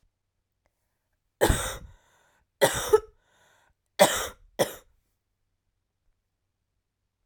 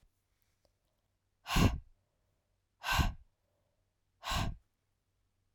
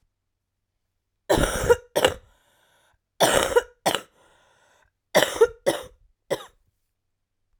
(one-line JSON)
{"three_cough_length": "7.3 s", "three_cough_amplitude": 21004, "three_cough_signal_mean_std_ratio": 0.25, "exhalation_length": "5.5 s", "exhalation_amplitude": 4973, "exhalation_signal_mean_std_ratio": 0.3, "cough_length": "7.6 s", "cough_amplitude": 26630, "cough_signal_mean_std_ratio": 0.33, "survey_phase": "alpha (2021-03-01 to 2021-08-12)", "age": "18-44", "gender": "Female", "wearing_mask": "No", "symptom_cough_any": true, "symptom_new_continuous_cough": true, "symptom_fatigue": true, "symptom_headache": true, "symptom_onset": "4 days", "smoker_status": "Never smoked", "respiratory_condition_asthma": false, "respiratory_condition_other": false, "recruitment_source": "Test and Trace", "submission_delay": "2 days", "covid_test_result": "Positive", "covid_test_method": "RT-qPCR", "covid_ct_value": 16.1, "covid_ct_gene": "ORF1ab gene", "covid_ct_mean": 16.7, "covid_viral_load": "3300000 copies/ml", "covid_viral_load_category": "High viral load (>1M copies/ml)"}